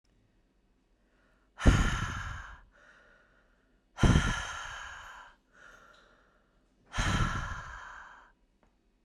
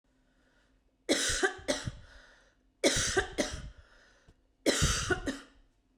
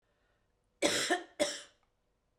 {"exhalation_length": "9.0 s", "exhalation_amplitude": 11947, "exhalation_signal_mean_std_ratio": 0.35, "three_cough_length": "6.0 s", "three_cough_amplitude": 9435, "three_cough_signal_mean_std_ratio": 0.47, "cough_length": "2.4 s", "cough_amplitude": 8970, "cough_signal_mean_std_ratio": 0.38, "survey_phase": "beta (2021-08-13 to 2022-03-07)", "age": "45-64", "gender": "Female", "wearing_mask": "No", "symptom_cough_any": true, "symptom_runny_or_blocked_nose": true, "symptom_sore_throat": true, "symptom_diarrhoea": true, "symptom_fever_high_temperature": true, "symptom_onset": "4 days", "smoker_status": "Never smoked", "respiratory_condition_asthma": false, "respiratory_condition_other": false, "recruitment_source": "Test and Trace", "submission_delay": "2 days", "covid_test_result": "Positive", "covid_test_method": "RT-qPCR", "covid_ct_value": 15.6, "covid_ct_gene": "ORF1ab gene", "covid_ct_mean": 16.0, "covid_viral_load": "5800000 copies/ml", "covid_viral_load_category": "High viral load (>1M copies/ml)"}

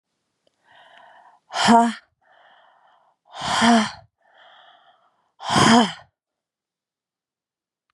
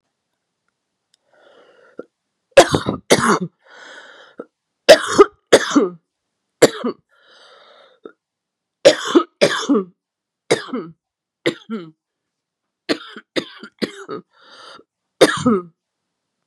{"exhalation_length": "7.9 s", "exhalation_amplitude": 27971, "exhalation_signal_mean_std_ratio": 0.32, "three_cough_length": "16.5 s", "three_cough_amplitude": 32768, "three_cough_signal_mean_std_ratio": 0.29, "survey_phase": "beta (2021-08-13 to 2022-03-07)", "age": "45-64", "gender": "Female", "wearing_mask": "No", "symptom_new_continuous_cough": true, "symptom_runny_or_blocked_nose": true, "symptom_fatigue": true, "symptom_headache": true, "symptom_change_to_sense_of_smell_or_taste": true, "symptom_onset": "4 days", "smoker_status": "Ex-smoker", "respiratory_condition_asthma": false, "respiratory_condition_other": false, "recruitment_source": "Test and Trace", "submission_delay": "1 day", "covid_test_result": "Positive", "covid_test_method": "RT-qPCR", "covid_ct_value": 22.3, "covid_ct_gene": "N gene"}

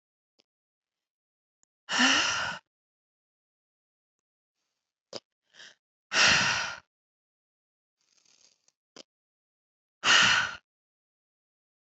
{"exhalation_length": "11.9 s", "exhalation_amplitude": 13197, "exhalation_signal_mean_std_ratio": 0.29, "survey_phase": "beta (2021-08-13 to 2022-03-07)", "age": "18-44", "gender": "Female", "wearing_mask": "No", "symptom_cough_any": true, "symptom_runny_or_blocked_nose": true, "symptom_fatigue": true, "symptom_onset": "2 days", "smoker_status": "Ex-smoker", "respiratory_condition_asthma": false, "respiratory_condition_other": false, "recruitment_source": "Test and Trace", "submission_delay": "2 days", "covid_test_result": "Positive", "covid_test_method": "RT-qPCR", "covid_ct_value": 17.9, "covid_ct_gene": "N gene", "covid_ct_mean": 18.8, "covid_viral_load": "690000 copies/ml", "covid_viral_load_category": "Low viral load (10K-1M copies/ml)"}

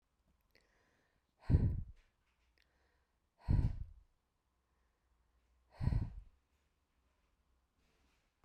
{"exhalation_length": "8.4 s", "exhalation_amplitude": 3936, "exhalation_signal_mean_std_ratio": 0.26, "survey_phase": "beta (2021-08-13 to 2022-03-07)", "age": "65+", "gender": "Female", "wearing_mask": "No", "symptom_none": true, "smoker_status": "Never smoked", "respiratory_condition_asthma": false, "respiratory_condition_other": false, "recruitment_source": "REACT", "submission_delay": "9 days", "covid_test_result": "Negative", "covid_test_method": "RT-qPCR"}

